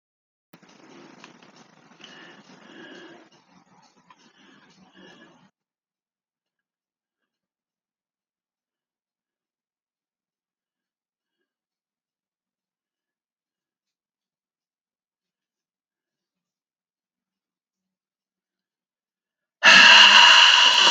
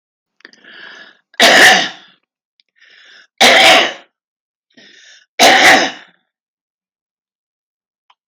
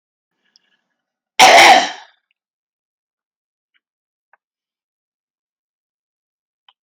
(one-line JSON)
{"exhalation_length": "20.9 s", "exhalation_amplitude": 31320, "exhalation_signal_mean_std_ratio": 0.2, "three_cough_length": "8.3 s", "three_cough_amplitude": 32768, "three_cough_signal_mean_std_ratio": 0.37, "cough_length": "6.8 s", "cough_amplitude": 32768, "cough_signal_mean_std_ratio": 0.22, "survey_phase": "alpha (2021-03-01 to 2021-08-12)", "age": "65+", "gender": "Female", "wearing_mask": "No", "symptom_none": true, "smoker_status": "Ex-smoker", "respiratory_condition_asthma": false, "respiratory_condition_other": false, "recruitment_source": "REACT", "submission_delay": "7 days", "covid_test_result": "Negative", "covid_test_method": "RT-qPCR"}